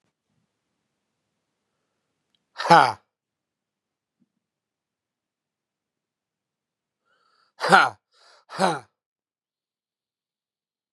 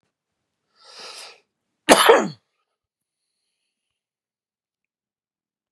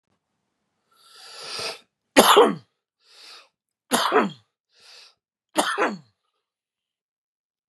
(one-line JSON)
{"exhalation_length": "10.9 s", "exhalation_amplitude": 32767, "exhalation_signal_mean_std_ratio": 0.17, "cough_length": "5.7 s", "cough_amplitude": 32768, "cough_signal_mean_std_ratio": 0.2, "three_cough_length": "7.7 s", "three_cough_amplitude": 32767, "three_cough_signal_mean_std_ratio": 0.29, "survey_phase": "beta (2021-08-13 to 2022-03-07)", "age": "45-64", "gender": "Male", "wearing_mask": "No", "symptom_none": true, "smoker_status": "Current smoker (e-cigarettes or vapes only)", "respiratory_condition_asthma": true, "respiratory_condition_other": false, "recruitment_source": "REACT", "submission_delay": "2 days", "covid_test_result": "Negative", "covid_test_method": "RT-qPCR", "influenza_a_test_result": "Negative", "influenza_b_test_result": "Negative"}